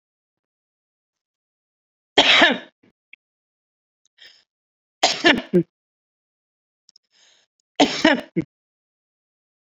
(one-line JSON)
{"three_cough_length": "9.7 s", "three_cough_amplitude": 30627, "three_cough_signal_mean_std_ratio": 0.26, "survey_phase": "beta (2021-08-13 to 2022-03-07)", "age": "65+", "gender": "Female", "wearing_mask": "No", "symptom_cough_any": true, "symptom_shortness_of_breath": true, "symptom_fatigue": true, "smoker_status": "Ex-smoker", "respiratory_condition_asthma": false, "respiratory_condition_other": false, "recruitment_source": "REACT", "submission_delay": "1 day", "covid_test_result": "Negative", "covid_test_method": "RT-qPCR"}